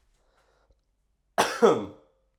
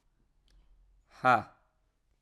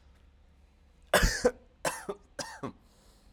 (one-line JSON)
{"cough_length": "2.4 s", "cough_amplitude": 18323, "cough_signal_mean_std_ratio": 0.3, "exhalation_length": "2.2 s", "exhalation_amplitude": 8666, "exhalation_signal_mean_std_ratio": 0.22, "three_cough_length": "3.3 s", "three_cough_amplitude": 10157, "three_cough_signal_mean_std_ratio": 0.34, "survey_phase": "alpha (2021-03-01 to 2021-08-12)", "age": "18-44", "gender": "Male", "wearing_mask": "No", "symptom_cough_any": true, "symptom_fatigue": true, "symptom_fever_high_temperature": true, "symptom_onset": "3 days", "smoker_status": "Never smoked", "respiratory_condition_asthma": false, "respiratory_condition_other": false, "recruitment_source": "Test and Trace", "submission_delay": "2 days", "covid_test_result": "Positive", "covid_test_method": "RT-qPCR", "covid_ct_value": 18.5, "covid_ct_gene": "ORF1ab gene"}